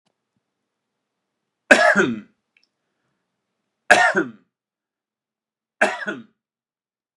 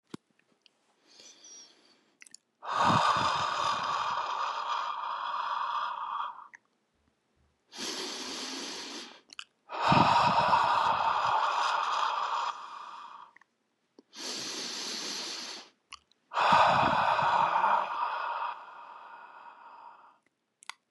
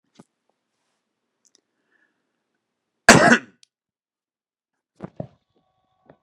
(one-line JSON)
{"three_cough_length": "7.2 s", "three_cough_amplitude": 32768, "three_cough_signal_mean_std_ratio": 0.27, "exhalation_length": "20.9 s", "exhalation_amplitude": 11807, "exhalation_signal_mean_std_ratio": 0.61, "cough_length": "6.2 s", "cough_amplitude": 32768, "cough_signal_mean_std_ratio": 0.17, "survey_phase": "beta (2021-08-13 to 2022-03-07)", "age": "45-64", "gender": "Male", "wearing_mask": "No", "symptom_none": true, "smoker_status": "Current smoker (1 to 10 cigarettes per day)", "respiratory_condition_asthma": false, "respiratory_condition_other": false, "recruitment_source": "REACT", "submission_delay": "2 days", "covid_test_result": "Negative", "covid_test_method": "RT-qPCR", "influenza_a_test_result": "Negative", "influenza_b_test_result": "Negative"}